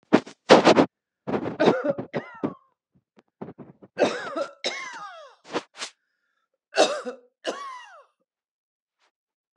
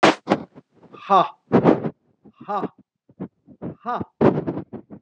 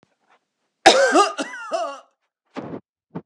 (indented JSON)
{
  "three_cough_length": "9.6 s",
  "three_cough_amplitude": 32420,
  "three_cough_signal_mean_std_ratio": 0.33,
  "exhalation_length": "5.0 s",
  "exhalation_amplitude": 30833,
  "exhalation_signal_mean_std_ratio": 0.4,
  "cough_length": "3.3 s",
  "cough_amplitude": 32768,
  "cough_signal_mean_std_ratio": 0.38,
  "survey_phase": "beta (2021-08-13 to 2022-03-07)",
  "age": "65+",
  "gender": "Female",
  "wearing_mask": "No",
  "symptom_none": true,
  "smoker_status": "Ex-smoker",
  "respiratory_condition_asthma": false,
  "respiratory_condition_other": false,
  "recruitment_source": "REACT",
  "submission_delay": "5 days",
  "covid_test_result": "Negative",
  "covid_test_method": "RT-qPCR"
}